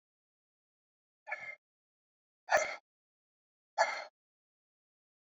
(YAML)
exhalation_length: 5.2 s
exhalation_amplitude: 6634
exhalation_signal_mean_std_ratio: 0.23
survey_phase: beta (2021-08-13 to 2022-03-07)
age: 65+
gender: Male
wearing_mask: 'No'
symptom_cough_any: true
symptom_runny_or_blocked_nose: true
symptom_sore_throat: true
symptom_fever_high_temperature: true
symptom_onset: 2 days
smoker_status: Never smoked
respiratory_condition_asthma: false
respiratory_condition_other: false
recruitment_source: Test and Trace
submission_delay: 1 day
covid_test_result: Positive
covid_test_method: RT-qPCR
covid_ct_value: 14.3
covid_ct_gene: ORF1ab gene
covid_ct_mean: 14.8
covid_viral_load: 14000000 copies/ml
covid_viral_load_category: High viral load (>1M copies/ml)